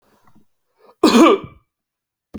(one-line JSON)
{"cough_length": "2.4 s", "cough_amplitude": 28931, "cough_signal_mean_std_ratio": 0.33, "survey_phase": "alpha (2021-03-01 to 2021-08-12)", "age": "18-44", "gender": "Male", "wearing_mask": "No", "symptom_none": true, "smoker_status": "Ex-smoker", "respiratory_condition_asthma": false, "respiratory_condition_other": false, "recruitment_source": "REACT", "submission_delay": "2 days", "covid_test_result": "Negative", "covid_test_method": "RT-qPCR"}